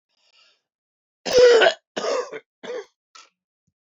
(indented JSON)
{
  "cough_length": "3.8 s",
  "cough_amplitude": 23710,
  "cough_signal_mean_std_ratio": 0.36,
  "survey_phase": "beta (2021-08-13 to 2022-03-07)",
  "age": "65+",
  "gender": "Male",
  "wearing_mask": "No",
  "symptom_none": true,
  "smoker_status": "Ex-smoker",
  "respiratory_condition_asthma": false,
  "respiratory_condition_other": false,
  "recruitment_source": "REACT",
  "submission_delay": "5 days",
  "covid_test_result": "Negative",
  "covid_test_method": "RT-qPCR"
}